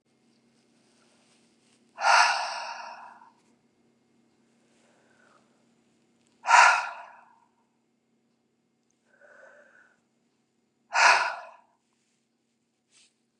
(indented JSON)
{
  "exhalation_length": "13.4 s",
  "exhalation_amplitude": 18302,
  "exhalation_signal_mean_std_ratio": 0.25,
  "survey_phase": "beta (2021-08-13 to 2022-03-07)",
  "age": "45-64",
  "gender": "Female",
  "wearing_mask": "No",
  "symptom_change_to_sense_of_smell_or_taste": true,
  "symptom_loss_of_taste": true,
  "symptom_onset": "4 days",
  "smoker_status": "Never smoked",
  "respiratory_condition_asthma": false,
  "respiratory_condition_other": false,
  "recruitment_source": "Test and Trace",
  "submission_delay": "2 days",
  "covid_test_result": "Positive",
  "covid_test_method": "RT-qPCR",
  "covid_ct_value": 18.6,
  "covid_ct_gene": "ORF1ab gene",
  "covid_ct_mean": 19.7,
  "covid_viral_load": "350000 copies/ml",
  "covid_viral_load_category": "Low viral load (10K-1M copies/ml)"
}